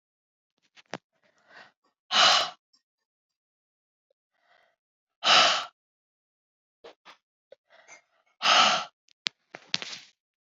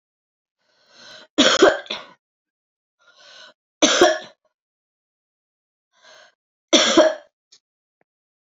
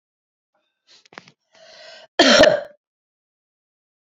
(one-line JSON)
{"exhalation_length": "10.4 s", "exhalation_amplitude": 23485, "exhalation_signal_mean_std_ratio": 0.27, "three_cough_length": "8.5 s", "three_cough_amplitude": 31526, "three_cough_signal_mean_std_ratio": 0.29, "cough_length": "4.1 s", "cough_amplitude": 28681, "cough_signal_mean_std_ratio": 0.26, "survey_phase": "beta (2021-08-13 to 2022-03-07)", "age": "65+", "gender": "Female", "wearing_mask": "No", "symptom_runny_or_blocked_nose": true, "symptom_sore_throat": true, "symptom_change_to_sense_of_smell_or_taste": true, "symptom_loss_of_taste": true, "symptom_onset": "2 days", "smoker_status": "Never smoked", "respiratory_condition_asthma": false, "respiratory_condition_other": false, "recruitment_source": "Test and Trace", "submission_delay": "2 days", "covid_test_result": "Positive", "covid_test_method": "RT-qPCR", "covid_ct_value": 26.8, "covid_ct_gene": "ORF1ab gene", "covid_ct_mean": 27.3, "covid_viral_load": "1200 copies/ml", "covid_viral_load_category": "Minimal viral load (< 10K copies/ml)"}